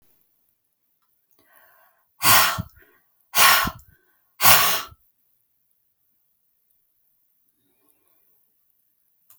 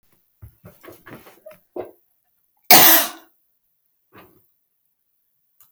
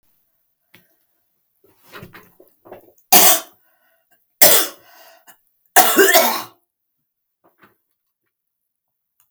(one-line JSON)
{"exhalation_length": "9.4 s", "exhalation_amplitude": 32768, "exhalation_signal_mean_std_ratio": 0.26, "cough_length": "5.7 s", "cough_amplitude": 32768, "cough_signal_mean_std_ratio": 0.21, "three_cough_length": "9.3 s", "three_cough_amplitude": 32768, "three_cough_signal_mean_std_ratio": 0.28, "survey_phase": "beta (2021-08-13 to 2022-03-07)", "age": "65+", "gender": "Female", "wearing_mask": "No", "symptom_cough_any": true, "symptom_onset": "11 days", "smoker_status": "Never smoked", "respiratory_condition_asthma": false, "respiratory_condition_other": false, "recruitment_source": "REACT", "submission_delay": "1 day", "covid_test_result": "Negative", "covid_test_method": "RT-qPCR"}